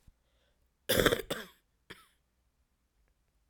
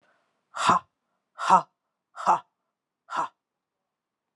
cough_length: 3.5 s
cough_amplitude: 14469
cough_signal_mean_std_ratio: 0.25
exhalation_length: 4.4 s
exhalation_amplitude: 19734
exhalation_signal_mean_std_ratio: 0.29
survey_phase: alpha (2021-03-01 to 2021-08-12)
age: 45-64
gender: Female
wearing_mask: 'No'
symptom_cough_any: true
symptom_new_continuous_cough: true
symptom_onset: 4 days
smoker_status: Never smoked
respiratory_condition_asthma: false
respiratory_condition_other: false
recruitment_source: Test and Trace
submission_delay: 2 days
covid_test_result: Positive
covid_test_method: RT-qPCR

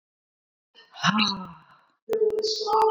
exhalation_length: 2.9 s
exhalation_amplitude: 16512
exhalation_signal_mean_std_ratio: 0.56
survey_phase: beta (2021-08-13 to 2022-03-07)
age: 65+
gender: Female
wearing_mask: 'No'
symptom_none: true
smoker_status: Never smoked
respiratory_condition_asthma: false
respiratory_condition_other: false
recruitment_source: REACT
submission_delay: 2 days
covid_test_result: Negative
covid_test_method: RT-qPCR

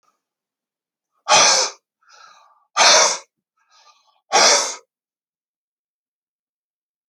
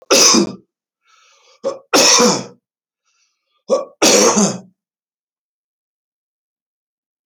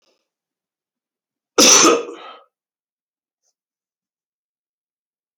exhalation_length: 7.1 s
exhalation_amplitude: 30192
exhalation_signal_mean_std_ratio: 0.33
three_cough_length: 7.3 s
three_cough_amplitude: 32062
three_cough_signal_mean_std_ratio: 0.39
cough_length: 5.4 s
cough_amplitude: 31185
cough_signal_mean_std_ratio: 0.24
survey_phase: alpha (2021-03-01 to 2021-08-12)
age: 45-64
gender: Male
wearing_mask: 'No'
symptom_none: true
smoker_status: Ex-smoker
respiratory_condition_asthma: false
respiratory_condition_other: false
recruitment_source: REACT
submission_delay: 2 days
covid_test_result: Negative
covid_test_method: RT-qPCR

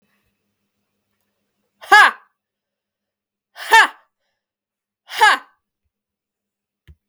exhalation_length: 7.1 s
exhalation_amplitude: 32768
exhalation_signal_mean_std_ratio: 0.23
survey_phase: beta (2021-08-13 to 2022-03-07)
age: 45-64
gender: Female
wearing_mask: 'No'
symptom_cough_any: true
symptom_new_continuous_cough: true
symptom_runny_or_blocked_nose: true
symptom_shortness_of_breath: true
symptom_sore_throat: true
symptom_fatigue: true
symptom_headache: true
symptom_change_to_sense_of_smell_or_taste: true
symptom_onset: 5 days
smoker_status: Never smoked
respiratory_condition_asthma: true
respiratory_condition_other: false
recruitment_source: Test and Trace
submission_delay: 2 days
covid_test_result: Positive
covid_test_method: RT-qPCR
covid_ct_value: 24.3
covid_ct_gene: ORF1ab gene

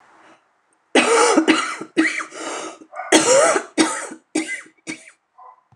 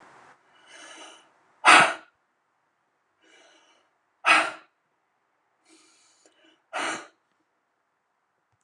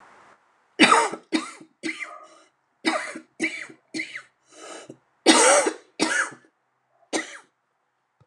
cough_length: 5.8 s
cough_amplitude: 29204
cough_signal_mean_std_ratio: 0.52
exhalation_length: 8.6 s
exhalation_amplitude: 29204
exhalation_signal_mean_std_ratio: 0.21
three_cough_length: 8.3 s
three_cough_amplitude: 27695
three_cough_signal_mean_std_ratio: 0.37
survey_phase: beta (2021-08-13 to 2022-03-07)
age: 45-64
gender: Female
wearing_mask: 'No'
symptom_cough_any: true
symptom_runny_or_blocked_nose: true
symptom_shortness_of_breath: true
symptom_fatigue: true
symptom_headache: true
symptom_onset: 12 days
smoker_status: Current smoker (11 or more cigarettes per day)
respiratory_condition_asthma: false
respiratory_condition_other: false
recruitment_source: REACT
submission_delay: 1 day
covid_test_result: Negative
covid_test_method: RT-qPCR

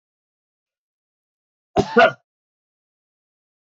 cough_length: 3.8 s
cough_amplitude: 27310
cough_signal_mean_std_ratio: 0.19
survey_phase: beta (2021-08-13 to 2022-03-07)
age: 45-64
gender: Male
wearing_mask: 'No'
symptom_none: true
smoker_status: Never smoked
respiratory_condition_asthma: false
respiratory_condition_other: false
recruitment_source: REACT
submission_delay: 1 day
covid_test_result: Negative
covid_test_method: RT-qPCR
influenza_a_test_result: Negative
influenza_b_test_result: Negative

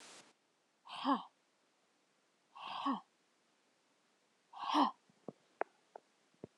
exhalation_length: 6.6 s
exhalation_amplitude: 3763
exhalation_signal_mean_std_ratio: 0.29
survey_phase: alpha (2021-03-01 to 2021-08-12)
age: 18-44
gender: Female
wearing_mask: 'No'
symptom_cough_any: true
symptom_fatigue: true
symptom_headache: true
symptom_change_to_sense_of_smell_or_taste: true
symptom_onset: 3 days
smoker_status: Never smoked
respiratory_condition_asthma: false
respiratory_condition_other: false
recruitment_source: Test and Trace
submission_delay: 2 days
covid_test_result: Positive
covid_test_method: RT-qPCR
covid_ct_value: 20.3
covid_ct_gene: ORF1ab gene
covid_ct_mean: 20.5
covid_viral_load: 200000 copies/ml
covid_viral_load_category: Low viral load (10K-1M copies/ml)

